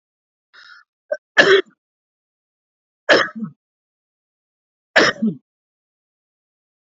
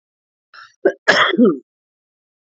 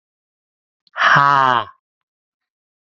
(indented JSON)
{
  "three_cough_length": "6.8 s",
  "three_cough_amplitude": 29101,
  "three_cough_signal_mean_std_ratio": 0.26,
  "cough_length": "2.5 s",
  "cough_amplitude": 28402,
  "cough_signal_mean_std_ratio": 0.37,
  "exhalation_length": "2.9 s",
  "exhalation_amplitude": 28228,
  "exhalation_signal_mean_std_ratio": 0.35,
  "survey_phase": "alpha (2021-03-01 to 2021-08-12)",
  "age": "18-44",
  "gender": "Male",
  "wearing_mask": "No",
  "symptom_new_continuous_cough": true,
  "symptom_fatigue": true,
  "symptom_headache": true,
  "symptom_change_to_sense_of_smell_or_taste": true,
  "symptom_loss_of_taste": true,
  "symptom_onset": "4 days",
  "smoker_status": "Never smoked",
  "respiratory_condition_asthma": false,
  "respiratory_condition_other": false,
  "recruitment_source": "Test and Trace",
  "submission_delay": "2 days",
  "covid_test_result": "Positive",
  "covid_test_method": "RT-qPCR",
  "covid_ct_value": 15.9,
  "covid_ct_gene": "ORF1ab gene",
  "covid_ct_mean": 17.0,
  "covid_viral_load": "2600000 copies/ml",
  "covid_viral_load_category": "High viral load (>1M copies/ml)"
}